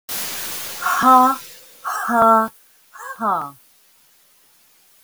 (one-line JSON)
{"exhalation_length": "5.0 s", "exhalation_amplitude": 32766, "exhalation_signal_mean_std_ratio": 0.47, "survey_phase": "beta (2021-08-13 to 2022-03-07)", "age": "65+", "gender": "Female", "wearing_mask": "No", "symptom_none": true, "smoker_status": "Never smoked", "respiratory_condition_asthma": false, "respiratory_condition_other": false, "recruitment_source": "REACT", "submission_delay": "1 day", "covid_test_result": "Negative", "covid_test_method": "RT-qPCR", "influenza_a_test_result": "Negative", "influenza_b_test_result": "Negative"}